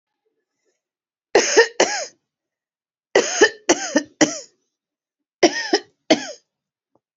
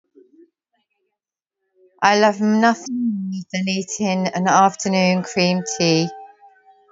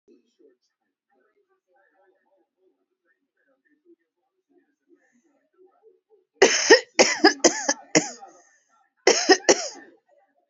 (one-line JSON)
{"three_cough_length": "7.2 s", "three_cough_amplitude": 32588, "three_cough_signal_mean_std_ratio": 0.33, "exhalation_length": "6.9 s", "exhalation_amplitude": 32678, "exhalation_signal_mean_std_ratio": 0.61, "cough_length": "10.5 s", "cough_amplitude": 32768, "cough_signal_mean_std_ratio": 0.25, "survey_phase": "beta (2021-08-13 to 2022-03-07)", "age": "45-64", "gender": "Female", "wearing_mask": "No", "symptom_none": true, "smoker_status": "Ex-smoker", "respiratory_condition_asthma": false, "respiratory_condition_other": false, "recruitment_source": "Test and Trace", "submission_delay": "-3 days", "covid_test_result": "Negative", "covid_test_method": "LFT"}